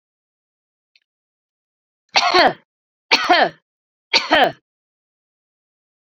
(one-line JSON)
{"three_cough_length": "6.1 s", "three_cough_amplitude": 32470, "three_cough_signal_mean_std_ratio": 0.31, "survey_phase": "beta (2021-08-13 to 2022-03-07)", "age": "45-64", "gender": "Female", "wearing_mask": "No", "symptom_none": true, "smoker_status": "Never smoked", "respiratory_condition_asthma": false, "respiratory_condition_other": false, "recruitment_source": "REACT", "submission_delay": "16 days", "covid_test_result": "Negative", "covid_test_method": "RT-qPCR"}